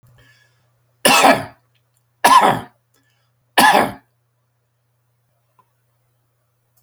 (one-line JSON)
{"three_cough_length": "6.8 s", "three_cough_amplitude": 32768, "three_cough_signal_mean_std_ratio": 0.31, "survey_phase": "beta (2021-08-13 to 2022-03-07)", "age": "45-64", "gender": "Male", "wearing_mask": "No", "symptom_none": true, "smoker_status": "Never smoked", "respiratory_condition_asthma": false, "respiratory_condition_other": false, "recruitment_source": "REACT", "submission_delay": "1 day", "covid_test_result": "Negative", "covid_test_method": "RT-qPCR", "influenza_a_test_result": "Negative", "influenza_b_test_result": "Negative"}